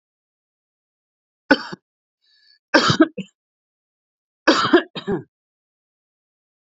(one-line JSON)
{"three_cough_length": "6.7 s", "three_cough_amplitude": 32767, "three_cough_signal_mean_std_ratio": 0.26, "survey_phase": "beta (2021-08-13 to 2022-03-07)", "age": "45-64", "gender": "Male", "wearing_mask": "No", "symptom_cough_any": true, "symptom_runny_or_blocked_nose": true, "symptom_fatigue": true, "symptom_headache": true, "smoker_status": "Ex-smoker", "respiratory_condition_asthma": false, "respiratory_condition_other": false, "recruitment_source": "Test and Trace", "submission_delay": "2 days", "covid_test_result": "Positive", "covid_test_method": "ePCR"}